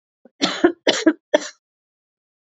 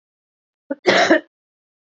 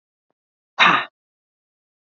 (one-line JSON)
{"three_cough_length": "2.5 s", "three_cough_amplitude": 28559, "three_cough_signal_mean_std_ratio": 0.33, "cough_length": "2.0 s", "cough_amplitude": 28440, "cough_signal_mean_std_ratio": 0.34, "exhalation_length": "2.1 s", "exhalation_amplitude": 28614, "exhalation_signal_mean_std_ratio": 0.26, "survey_phase": "beta (2021-08-13 to 2022-03-07)", "age": "45-64", "gender": "Female", "wearing_mask": "No", "symptom_cough_any": true, "symptom_runny_or_blocked_nose": true, "symptom_fever_high_temperature": true, "symptom_onset": "2 days", "smoker_status": "Ex-smoker", "respiratory_condition_asthma": false, "respiratory_condition_other": false, "recruitment_source": "Test and Trace", "submission_delay": "1 day", "covid_test_result": "Positive", "covid_test_method": "RT-qPCR", "covid_ct_value": 24.7, "covid_ct_gene": "ORF1ab gene"}